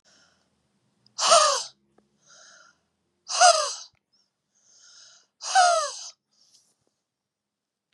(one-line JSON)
{"exhalation_length": "7.9 s", "exhalation_amplitude": 23944, "exhalation_signal_mean_std_ratio": 0.31, "survey_phase": "beta (2021-08-13 to 2022-03-07)", "age": "65+", "gender": "Female", "wearing_mask": "No", "symptom_none": true, "smoker_status": "Ex-smoker", "respiratory_condition_asthma": false, "respiratory_condition_other": false, "recruitment_source": "REACT", "submission_delay": "1 day", "covid_test_result": "Negative", "covid_test_method": "RT-qPCR", "influenza_a_test_result": "Negative", "influenza_b_test_result": "Negative"}